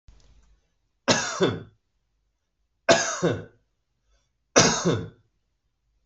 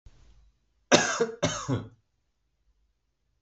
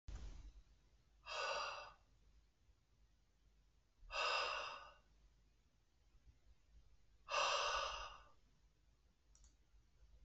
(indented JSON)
{
  "three_cough_length": "6.1 s",
  "three_cough_amplitude": 25337,
  "three_cough_signal_mean_std_ratio": 0.35,
  "cough_length": "3.4 s",
  "cough_amplitude": 21775,
  "cough_signal_mean_std_ratio": 0.33,
  "exhalation_length": "10.2 s",
  "exhalation_amplitude": 1357,
  "exhalation_signal_mean_std_ratio": 0.44,
  "survey_phase": "beta (2021-08-13 to 2022-03-07)",
  "age": "18-44",
  "gender": "Male",
  "wearing_mask": "No",
  "symptom_runny_or_blocked_nose": true,
  "symptom_sore_throat": true,
  "smoker_status": "Never smoked",
  "respiratory_condition_asthma": false,
  "respiratory_condition_other": false,
  "recruitment_source": "REACT",
  "submission_delay": "3 days",
  "covid_test_result": "Negative",
  "covid_test_method": "RT-qPCR"
}